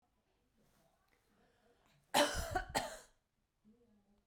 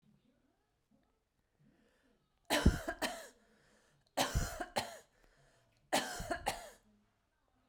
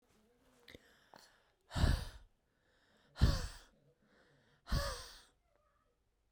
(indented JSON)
{
  "cough_length": "4.3 s",
  "cough_amplitude": 4747,
  "cough_signal_mean_std_ratio": 0.29,
  "three_cough_length": "7.7 s",
  "three_cough_amplitude": 6242,
  "three_cough_signal_mean_std_ratio": 0.33,
  "exhalation_length": "6.3 s",
  "exhalation_amplitude": 4279,
  "exhalation_signal_mean_std_ratio": 0.3,
  "survey_phase": "beta (2021-08-13 to 2022-03-07)",
  "age": "18-44",
  "gender": "Female",
  "wearing_mask": "No",
  "symptom_none": true,
  "smoker_status": "Never smoked",
  "respiratory_condition_asthma": true,
  "respiratory_condition_other": false,
  "recruitment_source": "REACT",
  "submission_delay": "2 days",
  "covid_test_result": "Negative",
  "covid_test_method": "RT-qPCR"
}